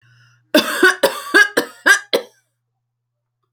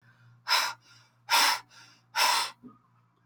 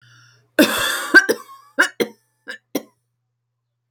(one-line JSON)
{"cough_length": "3.5 s", "cough_amplitude": 32768, "cough_signal_mean_std_ratio": 0.4, "exhalation_length": "3.3 s", "exhalation_amplitude": 9495, "exhalation_signal_mean_std_ratio": 0.44, "three_cough_length": "3.9 s", "three_cough_amplitude": 31290, "three_cough_signal_mean_std_ratio": 0.33, "survey_phase": "alpha (2021-03-01 to 2021-08-12)", "age": "45-64", "gender": "Female", "wearing_mask": "No", "symptom_none": true, "smoker_status": "Ex-smoker", "respiratory_condition_asthma": true, "respiratory_condition_other": false, "recruitment_source": "REACT", "submission_delay": "2 days", "covid_test_result": "Negative", "covid_test_method": "RT-qPCR"}